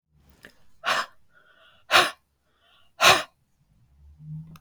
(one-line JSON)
{"exhalation_length": "4.6 s", "exhalation_amplitude": 29949, "exhalation_signal_mean_std_ratio": 0.29, "survey_phase": "beta (2021-08-13 to 2022-03-07)", "age": "65+", "gender": "Female", "wearing_mask": "No", "symptom_none": true, "smoker_status": "Ex-smoker", "respiratory_condition_asthma": false, "respiratory_condition_other": false, "recruitment_source": "REACT", "submission_delay": "1 day", "covid_test_result": "Negative", "covid_test_method": "RT-qPCR", "influenza_a_test_result": "Negative", "influenza_b_test_result": "Negative"}